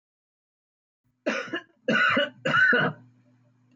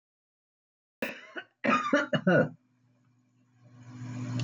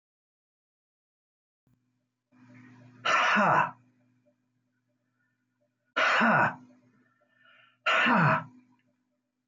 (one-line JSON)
{"three_cough_length": "3.8 s", "three_cough_amplitude": 9534, "three_cough_signal_mean_std_ratio": 0.47, "cough_length": "4.4 s", "cough_amplitude": 9440, "cough_signal_mean_std_ratio": 0.41, "exhalation_length": "9.5 s", "exhalation_amplitude": 8314, "exhalation_signal_mean_std_ratio": 0.37, "survey_phase": "beta (2021-08-13 to 2022-03-07)", "age": "65+", "gender": "Male", "wearing_mask": "No", "symptom_none": true, "smoker_status": "Ex-smoker", "respiratory_condition_asthma": false, "respiratory_condition_other": false, "recruitment_source": "REACT", "submission_delay": "1 day", "covid_test_result": "Negative", "covid_test_method": "RT-qPCR"}